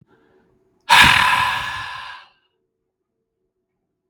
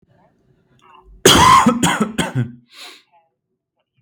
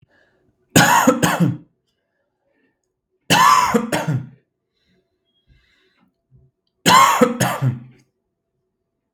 {"exhalation_length": "4.1 s", "exhalation_amplitude": 32768, "exhalation_signal_mean_std_ratio": 0.36, "cough_length": "4.0 s", "cough_amplitude": 32768, "cough_signal_mean_std_ratio": 0.41, "three_cough_length": "9.1 s", "three_cough_amplitude": 32768, "three_cough_signal_mean_std_ratio": 0.4, "survey_phase": "beta (2021-08-13 to 2022-03-07)", "age": "18-44", "gender": "Male", "wearing_mask": "No", "symptom_none": true, "smoker_status": "Never smoked", "respiratory_condition_asthma": false, "respiratory_condition_other": false, "recruitment_source": "REACT", "submission_delay": "2 days", "covid_test_result": "Negative", "covid_test_method": "RT-qPCR", "influenza_a_test_result": "Negative", "influenza_b_test_result": "Negative"}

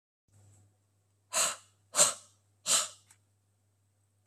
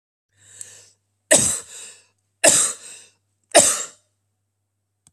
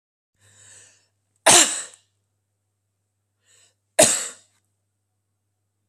{"exhalation_length": "4.3 s", "exhalation_amplitude": 11598, "exhalation_signal_mean_std_ratio": 0.29, "three_cough_length": "5.1 s", "three_cough_amplitude": 32768, "three_cough_signal_mean_std_ratio": 0.31, "cough_length": "5.9 s", "cough_amplitude": 32767, "cough_signal_mean_std_ratio": 0.23, "survey_phase": "beta (2021-08-13 to 2022-03-07)", "age": "65+", "gender": "Female", "wearing_mask": "No", "symptom_fatigue": true, "smoker_status": "Ex-smoker", "respiratory_condition_asthma": false, "respiratory_condition_other": false, "recruitment_source": "REACT", "submission_delay": "1 day", "covid_test_result": "Negative", "covid_test_method": "RT-qPCR"}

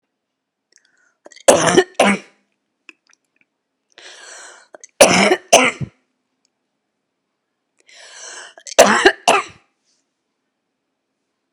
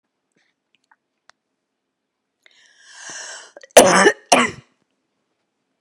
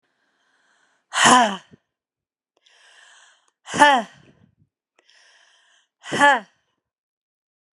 {"three_cough_length": "11.5 s", "three_cough_amplitude": 32768, "three_cough_signal_mean_std_ratio": 0.29, "cough_length": "5.8 s", "cough_amplitude": 32768, "cough_signal_mean_std_ratio": 0.24, "exhalation_length": "7.8 s", "exhalation_amplitude": 32746, "exhalation_signal_mean_std_ratio": 0.26, "survey_phase": "beta (2021-08-13 to 2022-03-07)", "age": "45-64", "gender": "Female", "wearing_mask": "No", "symptom_cough_any": true, "symptom_runny_or_blocked_nose": true, "symptom_sore_throat": true, "symptom_fatigue": true, "symptom_change_to_sense_of_smell_or_taste": true, "symptom_loss_of_taste": true, "symptom_onset": "5 days", "smoker_status": "Never smoked", "respiratory_condition_asthma": true, "respiratory_condition_other": false, "recruitment_source": "Test and Trace", "submission_delay": "1 day", "covid_test_result": "Positive", "covid_test_method": "RT-qPCR", "covid_ct_value": 13.8, "covid_ct_gene": "ORF1ab gene", "covid_ct_mean": 13.9, "covid_viral_load": "27000000 copies/ml", "covid_viral_load_category": "High viral load (>1M copies/ml)"}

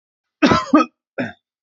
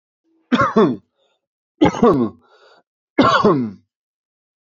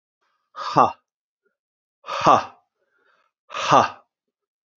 {"cough_length": "1.6 s", "cough_amplitude": 27535, "cough_signal_mean_std_ratio": 0.4, "three_cough_length": "4.6 s", "three_cough_amplitude": 28525, "three_cough_signal_mean_std_ratio": 0.44, "exhalation_length": "4.8 s", "exhalation_amplitude": 27618, "exhalation_signal_mean_std_ratio": 0.29, "survey_phase": "beta (2021-08-13 to 2022-03-07)", "age": "45-64", "gender": "Male", "wearing_mask": "No", "symptom_cough_any": true, "symptom_runny_or_blocked_nose": true, "symptom_sore_throat": true, "symptom_fatigue": true, "symptom_headache": true, "symptom_change_to_sense_of_smell_or_taste": true, "symptom_loss_of_taste": true, "smoker_status": "Never smoked", "respiratory_condition_asthma": false, "respiratory_condition_other": false, "recruitment_source": "Test and Trace", "submission_delay": "2 days", "covid_test_result": "Positive", "covid_test_method": "RT-qPCR", "covid_ct_value": 15.1, "covid_ct_gene": "ORF1ab gene", "covid_ct_mean": 15.3, "covid_viral_load": "9400000 copies/ml", "covid_viral_load_category": "High viral load (>1M copies/ml)"}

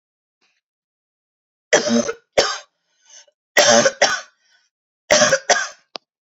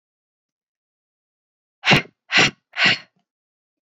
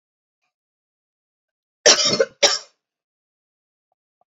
{"three_cough_length": "6.3 s", "three_cough_amplitude": 32292, "three_cough_signal_mean_std_ratio": 0.37, "exhalation_length": "3.9 s", "exhalation_amplitude": 30229, "exhalation_signal_mean_std_ratio": 0.28, "cough_length": "4.3 s", "cough_amplitude": 30286, "cough_signal_mean_std_ratio": 0.25, "survey_phase": "beta (2021-08-13 to 2022-03-07)", "age": "18-44", "gender": "Female", "wearing_mask": "No", "symptom_cough_any": true, "symptom_runny_or_blocked_nose": true, "smoker_status": "Never smoked", "respiratory_condition_asthma": false, "respiratory_condition_other": false, "recruitment_source": "REACT", "submission_delay": "2 days", "covid_test_result": "Negative", "covid_test_method": "RT-qPCR"}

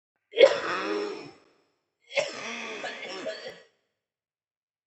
{"cough_length": "4.9 s", "cough_amplitude": 19199, "cough_signal_mean_std_ratio": 0.35, "survey_phase": "alpha (2021-03-01 to 2021-08-12)", "age": "18-44", "gender": "Female", "wearing_mask": "No", "symptom_cough_any": true, "symptom_shortness_of_breath": true, "symptom_fatigue": true, "symptom_headache": true, "symptom_onset": "9 days", "smoker_status": "Never smoked", "respiratory_condition_asthma": false, "respiratory_condition_other": false, "recruitment_source": "Test and Trace", "submission_delay": "2 days", "covid_test_result": "Positive", "covid_test_method": "RT-qPCR", "covid_ct_value": 19.8, "covid_ct_gene": "ORF1ab gene", "covid_ct_mean": 20.6, "covid_viral_load": "180000 copies/ml", "covid_viral_load_category": "Low viral load (10K-1M copies/ml)"}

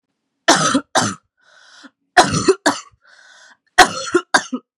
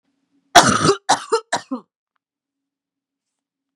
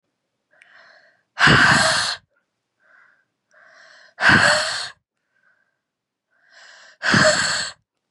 {"three_cough_length": "4.8 s", "three_cough_amplitude": 32768, "three_cough_signal_mean_std_ratio": 0.39, "cough_length": "3.8 s", "cough_amplitude": 32768, "cough_signal_mean_std_ratio": 0.3, "exhalation_length": "8.1 s", "exhalation_amplitude": 30324, "exhalation_signal_mean_std_ratio": 0.4, "survey_phase": "beta (2021-08-13 to 2022-03-07)", "age": "18-44", "gender": "Female", "wearing_mask": "No", "symptom_cough_any": true, "symptom_runny_or_blocked_nose": true, "symptom_sore_throat": true, "symptom_fatigue": true, "symptom_fever_high_temperature": true, "symptom_headache": true, "symptom_onset": "3 days", "smoker_status": "Never smoked", "respiratory_condition_asthma": false, "respiratory_condition_other": false, "recruitment_source": "Test and Trace", "submission_delay": "2 days", "covid_test_result": "Positive", "covid_test_method": "RT-qPCR", "covid_ct_value": 17.0, "covid_ct_gene": "N gene"}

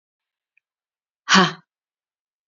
{"exhalation_length": "2.5 s", "exhalation_amplitude": 29247, "exhalation_signal_mean_std_ratio": 0.22, "survey_phase": "beta (2021-08-13 to 2022-03-07)", "age": "18-44", "gender": "Female", "wearing_mask": "No", "symptom_sore_throat": true, "symptom_onset": "3 days", "smoker_status": "Ex-smoker", "respiratory_condition_asthma": false, "respiratory_condition_other": false, "recruitment_source": "Test and Trace", "submission_delay": "2 days", "covid_test_result": "Negative", "covid_test_method": "RT-qPCR"}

